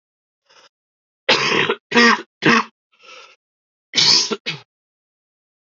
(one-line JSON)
{"cough_length": "5.6 s", "cough_amplitude": 30765, "cough_signal_mean_std_ratio": 0.39, "survey_phase": "alpha (2021-03-01 to 2021-08-12)", "age": "18-44", "gender": "Male", "wearing_mask": "No", "symptom_cough_any": true, "symptom_new_continuous_cough": true, "symptom_onset": "2 days", "smoker_status": "Never smoked", "respiratory_condition_asthma": false, "respiratory_condition_other": false, "recruitment_source": "Test and Trace", "submission_delay": "1 day", "covid_test_result": "Positive", "covid_test_method": "RT-qPCR", "covid_ct_value": 28.7, "covid_ct_gene": "N gene"}